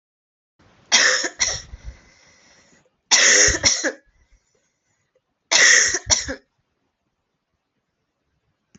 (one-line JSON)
{"three_cough_length": "8.8 s", "three_cough_amplitude": 32767, "three_cough_signal_mean_std_ratio": 0.37, "survey_phase": "alpha (2021-03-01 to 2021-08-12)", "age": "18-44", "gender": "Female", "wearing_mask": "No", "symptom_shortness_of_breath": true, "symptom_fatigue": true, "symptom_fever_high_temperature": true, "symptom_headache": true, "smoker_status": "Never smoked", "respiratory_condition_asthma": false, "respiratory_condition_other": false, "recruitment_source": "Test and Trace", "submission_delay": "2 days", "covid_test_result": "Positive", "covid_test_method": "RT-qPCR", "covid_ct_value": 25.4, "covid_ct_gene": "ORF1ab gene", "covid_ct_mean": 26.3, "covid_viral_load": "2400 copies/ml", "covid_viral_load_category": "Minimal viral load (< 10K copies/ml)"}